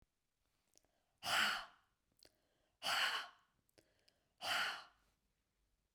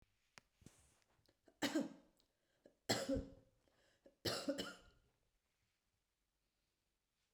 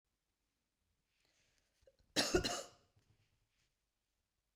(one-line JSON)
{"exhalation_length": "5.9 s", "exhalation_amplitude": 2310, "exhalation_signal_mean_std_ratio": 0.37, "three_cough_length": "7.3 s", "three_cough_amplitude": 2417, "three_cough_signal_mean_std_ratio": 0.3, "cough_length": "4.6 s", "cough_amplitude": 3451, "cough_signal_mean_std_ratio": 0.23, "survey_phase": "beta (2021-08-13 to 2022-03-07)", "age": "45-64", "gender": "Female", "wearing_mask": "No", "symptom_cough_any": true, "symptom_runny_or_blocked_nose": true, "symptom_sore_throat": true, "symptom_fatigue": true, "symptom_other": true, "symptom_onset": "2 days", "smoker_status": "Never smoked", "respiratory_condition_asthma": false, "respiratory_condition_other": false, "recruitment_source": "Test and Trace", "submission_delay": "1 day", "covid_test_result": "Positive", "covid_test_method": "ePCR"}